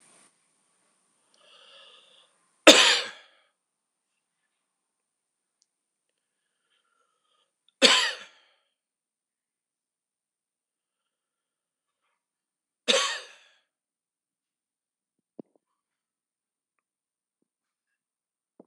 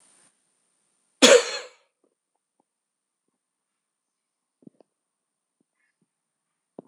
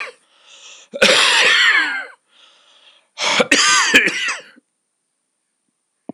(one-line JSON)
{"three_cough_length": "18.7 s", "three_cough_amplitude": 26028, "three_cough_signal_mean_std_ratio": 0.15, "cough_length": "6.9 s", "cough_amplitude": 26028, "cough_signal_mean_std_ratio": 0.15, "exhalation_length": "6.1 s", "exhalation_amplitude": 26028, "exhalation_signal_mean_std_ratio": 0.5, "survey_phase": "beta (2021-08-13 to 2022-03-07)", "age": "65+", "gender": "Male", "wearing_mask": "No", "symptom_cough_any": true, "symptom_runny_or_blocked_nose": true, "symptom_change_to_sense_of_smell_or_taste": true, "smoker_status": "Never smoked", "respiratory_condition_asthma": false, "respiratory_condition_other": false, "recruitment_source": "Test and Trace", "submission_delay": "2 days", "covid_test_result": "Positive", "covid_test_method": "RT-qPCR", "covid_ct_value": 24.0, "covid_ct_gene": "ORF1ab gene", "covid_ct_mean": 24.9, "covid_viral_load": "6800 copies/ml", "covid_viral_load_category": "Minimal viral load (< 10K copies/ml)"}